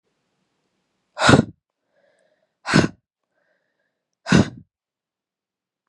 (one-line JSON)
{"exhalation_length": "5.9 s", "exhalation_amplitude": 32126, "exhalation_signal_mean_std_ratio": 0.23, "survey_phase": "beta (2021-08-13 to 2022-03-07)", "age": "18-44", "gender": "Female", "wearing_mask": "No", "symptom_cough_any": true, "symptom_new_continuous_cough": true, "symptom_runny_or_blocked_nose": true, "symptom_shortness_of_breath": true, "symptom_sore_throat": true, "symptom_abdominal_pain": true, "symptom_diarrhoea": true, "symptom_fatigue": true, "symptom_fever_high_temperature": true, "symptom_headache": true, "symptom_change_to_sense_of_smell_or_taste": true, "symptom_loss_of_taste": true, "symptom_onset": "2 days", "smoker_status": "Never smoked", "respiratory_condition_asthma": false, "respiratory_condition_other": false, "recruitment_source": "Test and Trace", "submission_delay": "2 days", "covid_test_result": "Positive", "covid_test_method": "RT-qPCR", "covid_ct_value": 18.5, "covid_ct_gene": "ORF1ab gene", "covid_ct_mean": 19.1, "covid_viral_load": "560000 copies/ml", "covid_viral_load_category": "Low viral load (10K-1M copies/ml)"}